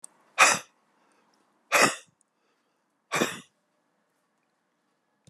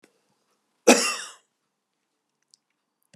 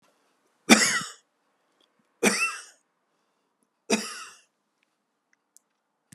{
  "exhalation_length": "5.3 s",
  "exhalation_amplitude": 25170,
  "exhalation_signal_mean_std_ratio": 0.25,
  "cough_length": "3.2 s",
  "cough_amplitude": 29662,
  "cough_signal_mean_std_ratio": 0.2,
  "three_cough_length": "6.1 s",
  "three_cough_amplitude": 32759,
  "three_cough_signal_mean_std_ratio": 0.26,
  "survey_phase": "beta (2021-08-13 to 2022-03-07)",
  "age": "65+",
  "gender": "Male",
  "wearing_mask": "No",
  "symptom_cough_any": true,
  "smoker_status": "Ex-smoker",
  "respiratory_condition_asthma": false,
  "respiratory_condition_other": true,
  "recruitment_source": "Test and Trace",
  "submission_delay": "2 days",
  "covid_test_result": "Negative",
  "covid_test_method": "RT-qPCR"
}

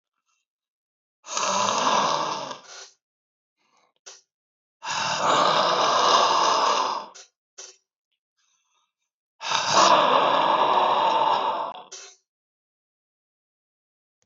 {
  "exhalation_length": "14.3 s",
  "exhalation_amplitude": 18950,
  "exhalation_signal_mean_std_ratio": 0.54,
  "survey_phase": "beta (2021-08-13 to 2022-03-07)",
  "age": "45-64",
  "gender": "Male",
  "wearing_mask": "No",
  "symptom_cough_any": true,
  "symptom_runny_or_blocked_nose": true,
  "symptom_shortness_of_breath": true,
  "symptom_sore_throat": true,
  "symptom_fatigue": true,
  "symptom_fever_high_temperature": true,
  "symptom_headache": true,
  "symptom_change_to_sense_of_smell_or_taste": true,
  "symptom_loss_of_taste": true,
  "symptom_onset": "5 days",
  "smoker_status": "Never smoked",
  "respiratory_condition_asthma": false,
  "respiratory_condition_other": false,
  "recruitment_source": "REACT",
  "submission_delay": "1 day",
  "covid_test_result": "Negative",
  "covid_test_method": "RT-qPCR",
  "influenza_a_test_result": "Negative",
  "influenza_b_test_result": "Negative"
}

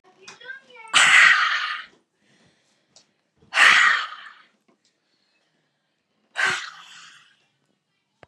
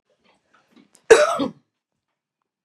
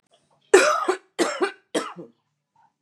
{
  "exhalation_length": "8.3 s",
  "exhalation_amplitude": 25997,
  "exhalation_signal_mean_std_ratio": 0.35,
  "cough_length": "2.6 s",
  "cough_amplitude": 32768,
  "cough_signal_mean_std_ratio": 0.25,
  "three_cough_length": "2.8 s",
  "three_cough_amplitude": 32489,
  "three_cough_signal_mean_std_ratio": 0.38,
  "survey_phase": "beta (2021-08-13 to 2022-03-07)",
  "age": "45-64",
  "gender": "Female",
  "wearing_mask": "No",
  "symptom_none": true,
  "smoker_status": "Current smoker (e-cigarettes or vapes only)",
  "respiratory_condition_asthma": false,
  "respiratory_condition_other": false,
  "recruitment_source": "REACT",
  "submission_delay": "1 day",
  "covid_test_result": "Negative",
  "covid_test_method": "RT-qPCR",
  "influenza_a_test_result": "Negative",
  "influenza_b_test_result": "Negative"
}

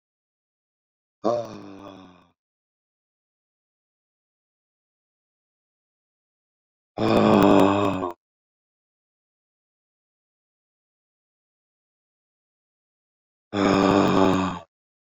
{
  "exhalation_length": "15.2 s",
  "exhalation_amplitude": 21473,
  "exhalation_signal_mean_std_ratio": 0.3,
  "survey_phase": "beta (2021-08-13 to 2022-03-07)",
  "age": "45-64",
  "gender": "Male",
  "wearing_mask": "No",
  "symptom_shortness_of_breath": true,
  "symptom_fatigue": true,
  "smoker_status": "Ex-smoker",
  "respiratory_condition_asthma": false,
  "respiratory_condition_other": false,
  "recruitment_source": "REACT",
  "submission_delay": "3 days",
  "covid_test_result": "Negative",
  "covid_test_method": "RT-qPCR"
}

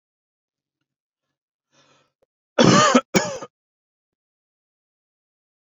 {
  "cough_length": "5.6 s",
  "cough_amplitude": 27520,
  "cough_signal_mean_std_ratio": 0.24,
  "survey_phase": "beta (2021-08-13 to 2022-03-07)",
  "age": "45-64",
  "gender": "Male",
  "wearing_mask": "No",
  "symptom_none": true,
  "smoker_status": "Ex-smoker",
  "respiratory_condition_asthma": false,
  "respiratory_condition_other": false,
  "recruitment_source": "REACT",
  "submission_delay": "0 days",
  "covid_test_result": "Negative",
  "covid_test_method": "RT-qPCR"
}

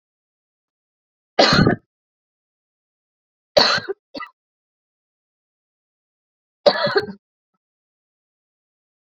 {
  "three_cough_length": "9.0 s",
  "three_cough_amplitude": 28777,
  "three_cough_signal_mean_std_ratio": 0.25,
  "survey_phase": "beta (2021-08-13 to 2022-03-07)",
  "age": "45-64",
  "gender": "Female",
  "wearing_mask": "No",
  "symptom_cough_any": true,
  "symptom_fatigue": true,
  "symptom_change_to_sense_of_smell_or_taste": true,
  "symptom_other": true,
  "symptom_onset": "4 days",
  "smoker_status": "Never smoked",
  "respiratory_condition_asthma": false,
  "respiratory_condition_other": false,
  "recruitment_source": "Test and Trace",
  "submission_delay": "1 day",
  "covid_test_result": "Positive",
  "covid_test_method": "RT-qPCR",
  "covid_ct_value": 18.6,
  "covid_ct_gene": "ORF1ab gene",
  "covid_ct_mean": 19.0,
  "covid_viral_load": "590000 copies/ml",
  "covid_viral_load_category": "Low viral load (10K-1M copies/ml)"
}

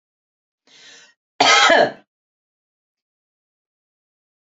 {
  "cough_length": "4.4 s",
  "cough_amplitude": 29420,
  "cough_signal_mean_std_ratio": 0.27,
  "survey_phase": "beta (2021-08-13 to 2022-03-07)",
  "age": "45-64",
  "gender": "Female",
  "wearing_mask": "No",
  "symptom_none": true,
  "smoker_status": "Never smoked",
  "respiratory_condition_asthma": false,
  "respiratory_condition_other": false,
  "recruitment_source": "REACT",
  "submission_delay": "2 days",
  "covid_test_result": "Negative",
  "covid_test_method": "RT-qPCR",
  "influenza_a_test_result": "Negative",
  "influenza_b_test_result": "Negative"
}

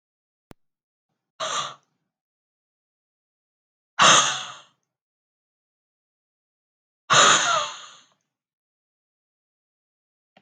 {
  "exhalation_length": "10.4 s",
  "exhalation_amplitude": 25800,
  "exhalation_signal_mean_std_ratio": 0.25,
  "survey_phase": "beta (2021-08-13 to 2022-03-07)",
  "age": "18-44",
  "gender": "Female",
  "wearing_mask": "No",
  "symptom_cough_any": true,
  "symptom_runny_or_blocked_nose": true,
  "symptom_loss_of_taste": true,
  "symptom_onset": "3 days",
  "smoker_status": "Never smoked",
  "respiratory_condition_asthma": false,
  "respiratory_condition_other": false,
  "recruitment_source": "Test and Trace",
  "submission_delay": "2 days",
  "covid_test_result": "Positive",
  "covid_test_method": "RT-qPCR",
  "covid_ct_value": 15.7,
  "covid_ct_gene": "ORF1ab gene",
  "covid_ct_mean": 16.0,
  "covid_viral_load": "5600000 copies/ml",
  "covid_viral_load_category": "High viral load (>1M copies/ml)"
}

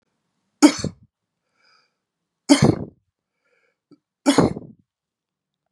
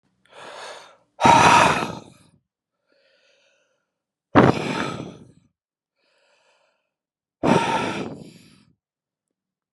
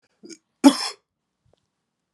{
  "three_cough_length": "5.7 s",
  "three_cough_amplitude": 32436,
  "three_cough_signal_mean_std_ratio": 0.25,
  "exhalation_length": "9.7 s",
  "exhalation_amplitude": 32766,
  "exhalation_signal_mean_std_ratio": 0.33,
  "cough_length": "2.1 s",
  "cough_amplitude": 31462,
  "cough_signal_mean_std_ratio": 0.2,
  "survey_phase": "beta (2021-08-13 to 2022-03-07)",
  "age": "45-64",
  "gender": "Male",
  "wearing_mask": "No",
  "symptom_runny_or_blocked_nose": true,
  "symptom_onset": "2 days",
  "smoker_status": "Ex-smoker",
  "respiratory_condition_asthma": false,
  "respiratory_condition_other": false,
  "recruitment_source": "Test and Trace",
  "submission_delay": "1 day",
  "covid_test_result": "Positive",
  "covid_test_method": "RT-qPCR",
  "covid_ct_value": 20.6,
  "covid_ct_gene": "ORF1ab gene",
  "covid_ct_mean": 21.7,
  "covid_viral_load": "74000 copies/ml",
  "covid_viral_load_category": "Low viral load (10K-1M copies/ml)"
}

